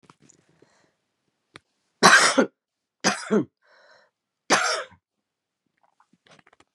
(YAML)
three_cough_length: 6.7 s
three_cough_amplitude: 30906
three_cough_signal_mean_std_ratio: 0.28
survey_phase: beta (2021-08-13 to 2022-03-07)
age: 45-64
gender: Female
wearing_mask: 'No'
symptom_cough_any: true
symptom_runny_or_blocked_nose: true
symptom_sore_throat: true
symptom_fever_high_temperature: true
symptom_headache: true
symptom_other: true
symptom_onset: 4 days
smoker_status: Current smoker (1 to 10 cigarettes per day)
respiratory_condition_asthma: false
respiratory_condition_other: false
recruitment_source: Test and Trace
submission_delay: 1 day
covid_test_result: Positive
covid_test_method: RT-qPCR
covid_ct_value: 21.8
covid_ct_gene: ORF1ab gene
covid_ct_mean: 22.5
covid_viral_load: 43000 copies/ml
covid_viral_load_category: Low viral load (10K-1M copies/ml)